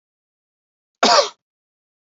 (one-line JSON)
{"cough_length": "2.1 s", "cough_amplitude": 27620, "cough_signal_mean_std_ratio": 0.26, "survey_phase": "beta (2021-08-13 to 2022-03-07)", "age": "18-44", "gender": "Male", "wearing_mask": "No", "symptom_none": true, "smoker_status": "Never smoked", "respiratory_condition_asthma": false, "respiratory_condition_other": false, "recruitment_source": "REACT", "submission_delay": "2 days", "covid_test_result": "Negative", "covid_test_method": "RT-qPCR", "influenza_a_test_result": "Negative", "influenza_b_test_result": "Negative"}